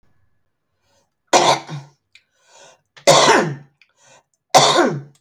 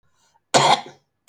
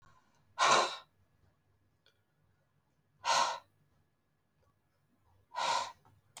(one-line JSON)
{"three_cough_length": "5.2 s", "three_cough_amplitude": 32768, "three_cough_signal_mean_std_ratio": 0.39, "cough_length": "1.3 s", "cough_amplitude": 29171, "cough_signal_mean_std_ratio": 0.36, "exhalation_length": "6.4 s", "exhalation_amplitude": 8052, "exhalation_signal_mean_std_ratio": 0.31, "survey_phase": "beta (2021-08-13 to 2022-03-07)", "age": "45-64", "gender": "Female", "wearing_mask": "No", "symptom_fatigue": true, "smoker_status": "Current smoker (11 or more cigarettes per day)", "respiratory_condition_asthma": false, "respiratory_condition_other": false, "recruitment_source": "REACT", "submission_delay": "1 day", "covid_test_result": "Negative", "covid_test_method": "RT-qPCR"}